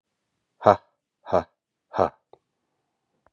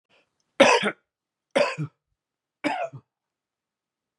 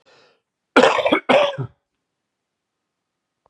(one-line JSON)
{"exhalation_length": "3.3 s", "exhalation_amplitude": 29728, "exhalation_signal_mean_std_ratio": 0.2, "three_cough_length": "4.2 s", "three_cough_amplitude": 25826, "three_cough_signal_mean_std_ratio": 0.3, "cough_length": "3.5 s", "cough_amplitude": 32767, "cough_signal_mean_std_ratio": 0.34, "survey_phase": "beta (2021-08-13 to 2022-03-07)", "age": "45-64", "gender": "Male", "wearing_mask": "No", "symptom_cough_any": true, "symptom_new_continuous_cough": true, "symptom_runny_or_blocked_nose": true, "symptom_fatigue": true, "symptom_fever_high_temperature": true, "symptom_onset": "5 days", "smoker_status": "Never smoked", "respiratory_condition_asthma": false, "respiratory_condition_other": false, "recruitment_source": "REACT", "submission_delay": "2 days", "covid_test_result": "Negative", "covid_test_method": "RT-qPCR", "influenza_a_test_result": "Negative", "influenza_b_test_result": "Negative"}